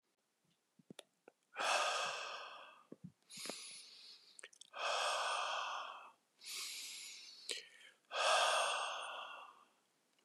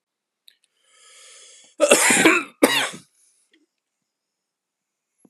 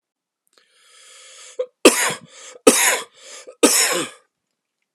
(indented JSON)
{
  "exhalation_length": "10.2 s",
  "exhalation_amplitude": 2835,
  "exhalation_signal_mean_std_ratio": 0.55,
  "cough_length": "5.3 s",
  "cough_amplitude": 32767,
  "cough_signal_mean_std_ratio": 0.32,
  "three_cough_length": "4.9 s",
  "three_cough_amplitude": 32768,
  "three_cough_signal_mean_std_ratio": 0.35,
  "survey_phase": "beta (2021-08-13 to 2022-03-07)",
  "age": "18-44",
  "gender": "Male",
  "wearing_mask": "No",
  "symptom_cough_any": true,
  "symptom_runny_or_blocked_nose": true,
  "symptom_fatigue": true,
  "symptom_headache": true,
  "smoker_status": "Never smoked",
  "respiratory_condition_asthma": false,
  "respiratory_condition_other": false,
  "recruitment_source": "Test and Trace",
  "submission_delay": "3 days",
  "covid_test_result": "Positive",
  "covid_test_method": "RT-qPCR",
  "covid_ct_value": 27.4,
  "covid_ct_gene": "ORF1ab gene",
  "covid_ct_mean": 28.3,
  "covid_viral_load": "520 copies/ml",
  "covid_viral_load_category": "Minimal viral load (< 10K copies/ml)"
}